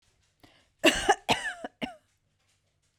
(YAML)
cough_length: 3.0 s
cough_amplitude: 15804
cough_signal_mean_std_ratio: 0.3
survey_phase: beta (2021-08-13 to 2022-03-07)
age: 18-44
gender: Female
wearing_mask: 'No'
symptom_none: true
smoker_status: Ex-smoker
respiratory_condition_asthma: false
respiratory_condition_other: false
recruitment_source: REACT
submission_delay: 2 days
covid_test_result: Negative
covid_test_method: RT-qPCR